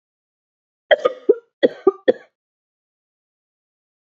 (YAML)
cough_length: 4.0 s
cough_amplitude: 29289
cough_signal_mean_std_ratio: 0.21
survey_phase: beta (2021-08-13 to 2022-03-07)
age: 18-44
gender: Female
wearing_mask: 'No'
symptom_new_continuous_cough: true
symptom_runny_or_blocked_nose: true
symptom_diarrhoea: true
symptom_fatigue: true
symptom_headache: true
symptom_onset: 4 days
smoker_status: Never smoked
respiratory_condition_asthma: true
respiratory_condition_other: false
recruitment_source: Test and Trace
submission_delay: 2 days
covid_test_result: Positive
covid_test_method: RT-qPCR
covid_ct_value: 21.1
covid_ct_gene: ORF1ab gene
covid_ct_mean: 21.5
covid_viral_load: 91000 copies/ml
covid_viral_load_category: Low viral load (10K-1M copies/ml)